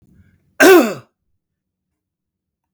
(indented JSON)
{
  "cough_length": "2.7 s",
  "cough_amplitude": 32768,
  "cough_signal_mean_std_ratio": 0.28,
  "survey_phase": "beta (2021-08-13 to 2022-03-07)",
  "age": "65+",
  "gender": "Male",
  "wearing_mask": "No",
  "symptom_none": true,
  "smoker_status": "Ex-smoker",
  "respiratory_condition_asthma": false,
  "respiratory_condition_other": false,
  "recruitment_source": "REACT",
  "submission_delay": "3 days",
  "covid_test_result": "Negative",
  "covid_test_method": "RT-qPCR",
  "influenza_a_test_result": "Negative",
  "influenza_b_test_result": "Negative"
}